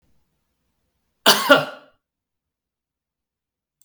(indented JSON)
{
  "cough_length": "3.8 s",
  "cough_amplitude": 32768,
  "cough_signal_mean_std_ratio": 0.22,
  "survey_phase": "beta (2021-08-13 to 2022-03-07)",
  "age": "45-64",
  "gender": "Male",
  "wearing_mask": "No",
  "symptom_change_to_sense_of_smell_or_taste": true,
  "symptom_onset": "3 days",
  "smoker_status": "Ex-smoker",
  "respiratory_condition_asthma": false,
  "respiratory_condition_other": false,
  "recruitment_source": "Test and Trace",
  "submission_delay": "2 days",
  "covid_test_result": "Positive",
  "covid_test_method": "RT-qPCR"
}